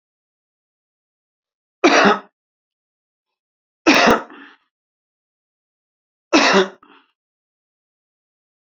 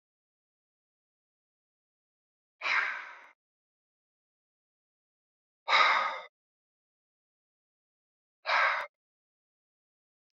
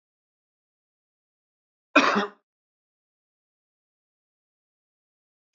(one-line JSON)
{"three_cough_length": "8.6 s", "three_cough_amplitude": 31456, "three_cough_signal_mean_std_ratio": 0.27, "exhalation_length": "10.3 s", "exhalation_amplitude": 9750, "exhalation_signal_mean_std_ratio": 0.26, "cough_length": "5.5 s", "cough_amplitude": 23298, "cough_signal_mean_std_ratio": 0.17, "survey_phase": "beta (2021-08-13 to 2022-03-07)", "age": "45-64", "gender": "Male", "wearing_mask": "No", "symptom_cough_any": true, "smoker_status": "Current smoker (11 or more cigarettes per day)", "respiratory_condition_asthma": false, "respiratory_condition_other": false, "recruitment_source": "REACT", "submission_delay": "1 day", "covid_test_result": "Negative", "covid_test_method": "RT-qPCR"}